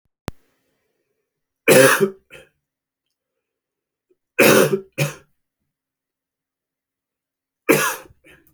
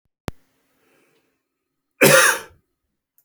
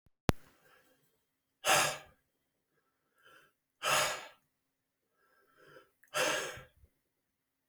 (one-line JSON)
{"three_cough_length": "8.5 s", "three_cough_amplitude": 32749, "three_cough_signal_mean_std_ratio": 0.28, "cough_length": "3.2 s", "cough_amplitude": 32767, "cough_signal_mean_std_ratio": 0.27, "exhalation_length": "7.7 s", "exhalation_amplitude": 12218, "exhalation_signal_mean_std_ratio": 0.3, "survey_phase": "beta (2021-08-13 to 2022-03-07)", "age": "45-64", "gender": "Male", "wearing_mask": "No", "symptom_cough_any": true, "symptom_new_continuous_cough": true, "symptom_runny_or_blocked_nose": true, "symptom_onset": "2 days", "smoker_status": "Never smoked", "respiratory_condition_asthma": false, "respiratory_condition_other": false, "recruitment_source": "Test and Trace", "submission_delay": "1 day", "covid_test_result": "Positive", "covid_test_method": "LAMP"}